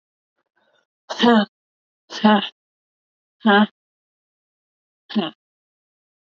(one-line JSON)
{"exhalation_length": "6.3 s", "exhalation_amplitude": 25736, "exhalation_signal_mean_std_ratio": 0.3, "survey_phase": "beta (2021-08-13 to 2022-03-07)", "age": "18-44", "gender": "Female", "wearing_mask": "No", "symptom_cough_any": true, "symptom_runny_or_blocked_nose": true, "symptom_fatigue": true, "smoker_status": "Never smoked", "respiratory_condition_asthma": false, "respiratory_condition_other": false, "recruitment_source": "Test and Trace", "submission_delay": "0 days", "covid_test_result": "Negative", "covid_test_method": "RT-qPCR"}